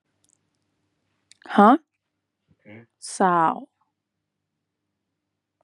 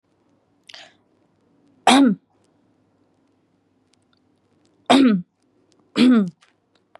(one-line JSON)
{"exhalation_length": "5.6 s", "exhalation_amplitude": 27510, "exhalation_signal_mean_std_ratio": 0.24, "three_cough_length": "7.0 s", "three_cough_amplitude": 31589, "three_cough_signal_mean_std_ratio": 0.31, "survey_phase": "beta (2021-08-13 to 2022-03-07)", "age": "18-44", "gender": "Female", "wearing_mask": "Yes", "symptom_none": true, "symptom_onset": "6 days", "smoker_status": "Never smoked", "respiratory_condition_asthma": false, "respiratory_condition_other": false, "recruitment_source": "Test and Trace", "submission_delay": "0 days", "covid_test_result": "Positive", "covid_test_method": "RT-qPCR", "covid_ct_value": 29.3, "covid_ct_gene": "ORF1ab gene"}